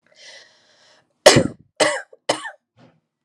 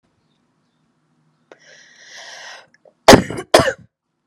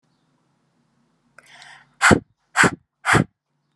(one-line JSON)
{"three_cough_length": "3.2 s", "three_cough_amplitude": 32768, "three_cough_signal_mean_std_ratio": 0.27, "cough_length": "4.3 s", "cough_amplitude": 32768, "cough_signal_mean_std_ratio": 0.22, "exhalation_length": "3.8 s", "exhalation_amplitude": 31341, "exhalation_signal_mean_std_ratio": 0.28, "survey_phase": "alpha (2021-03-01 to 2021-08-12)", "age": "18-44", "gender": "Female", "wearing_mask": "No", "symptom_change_to_sense_of_smell_or_taste": true, "symptom_onset": "4 days", "smoker_status": "Never smoked", "respiratory_condition_asthma": false, "respiratory_condition_other": false, "recruitment_source": "Test and Trace", "submission_delay": "2 days", "covid_test_result": "Positive", "covid_test_method": "RT-qPCR"}